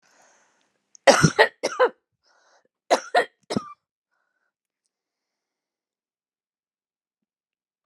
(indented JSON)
{
  "cough_length": "7.9 s",
  "cough_amplitude": 30695,
  "cough_signal_mean_std_ratio": 0.22,
  "survey_phase": "beta (2021-08-13 to 2022-03-07)",
  "age": "45-64",
  "gender": "Female",
  "wearing_mask": "No",
  "symptom_none": true,
  "smoker_status": "Current smoker (e-cigarettes or vapes only)",
  "respiratory_condition_asthma": false,
  "respiratory_condition_other": false,
  "recruitment_source": "REACT",
  "submission_delay": "2 days",
  "covid_test_result": "Negative",
  "covid_test_method": "RT-qPCR"
}